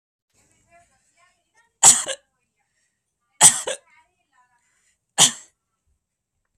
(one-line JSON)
{"three_cough_length": "6.6 s", "three_cough_amplitude": 32768, "three_cough_signal_mean_std_ratio": 0.21, "survey_phase": "beta (2021-08-13 to 2022-03-07)", "age": "18-44", "gender": "Male", "wearing_mask": "No", "symptom_none": true, "smoker_status": "Never smoked", "respiratory_condition_asthma": false, "respiratory_condition_other": false, "recruitment_source": "REACT", "submission_delay": "5 days", "covid_test_result": "Negative", "covid_test_method": "RT-qPCR", "influenza_a_test_result": "Negative", "influenza_b_test_result": "Negative"}